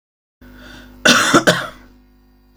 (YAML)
cough_length: 2.6 s
cough_amplitude: 32768
cough_signal_mean_std_ratio: 0.38
survey_phase: beta (2021-08-13 to 2022-03-07)
age: 45-64
gender: Female
wearing_mask: 'No'
symptom_none: true
smoker_status: Ex-smoker
respiratory_condition_asthma: false
respiratory_condition_other: false
recruitment_source: REACT
submission_delay: 2 days
covid_test_result: Negative
covid_test_method: RT-qPCR
influenza_a_test_result: Negative
influenza_b_test_result: Negative